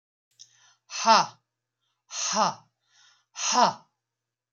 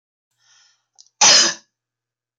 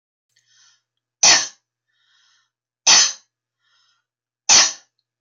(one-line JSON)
{"exhalation_length": "4.5 s", "exhalation_amplitude": 16149, "exhalation_signal_mean_std_ratio": 0.34, "cough_length": "2.4 s", "cough_amplitude": 25783, "cough_signal_mean_std_ratio": 0.3, "three_cough_length": "5.2 s", "three_cough_amplitude": 25255, "three_cough_signal_mean_std_ratio": 0.29, "survey_phase": "beta (2021-08-13 to 2022-03-07)", "age": "45-64", "gender": "Female", "wearing_mask": "No", "symptom_none": true, "smoker_status": "Never smoked", "respiratory_condition_asthma": false, "respiratory_condition_other": false, "recruitment_source": "REACT", "submission_delay": "2 days", "covid_test_result": "Negative", "covid_test_method": "RT-qPCR", "influenza_a_test_result": "Negative", "influenza_b_test_result": "Negative"}